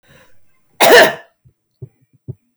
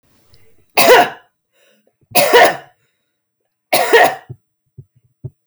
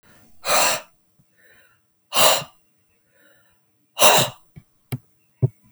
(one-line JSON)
{"cough_length": "2.6 s", "cough_amplitude": 32768, "cough_signal_mean_std_ratio": 0.32, "three_cough_length": "5.5 s", "three_cough_amplitude": 32768, "three_cough_signal_mean_std_ratio": 0.38, "exhalation_length": "5.7 s", "exhalation_amplitude": 32768, "exhalation_signal_mean_std_ratio": 0.33, "survey_phase": "beta (2021-08-13 to 2022-03-07)", "age": "45-64", "gender": "Female", "wearing_mask": "No", "symptom_none": true, "smoker_status": "Never smoked", "respiratory_condition_asthma": false, "respiratory_condition_other": false, "recruitment_source": "REACT", "submission_delay": "0 days", "covid_test_result": "Negative", "covid_test_method": "RT-qPCR"}